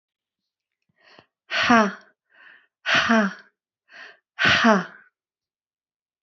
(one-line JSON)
{"exhalation_length": "6.2 s", "exhalation_amplitude": 26667, "exhalation_signal_mean_std_ratio": 0.35, "survey_phase": "alpha (2021-03-01 to 2021-08-12)", "age": "65+", "gender": "Female", "wearing_mask": "No", "symptom_cough_any": true, "symptom_fatigue": true, "symptom_fever_high_temperature": true, "symptom_headache": true, "symptom_change_to_sense_of_smell_or_taste": true, "symptom_onset": "3 days", "smoker_status": "Never smoked", "respiratory_condition_asthma": false, "respiratory_condition_other": false, "recruitment_source": "Test and Trace", "submission_delay": "2 days", "covid_test_result": "Positive", "covid_test_method": "RT-qPCR", "covid_ct_value": 15.5, "covid_ct_gene": "ORF1ab gene", "covid_ct_mean": 20.0, "covid_viral_load": "270000 copies/ml", "covid_viral_load_category": "Low viral load (10K-1M copies/ml)"}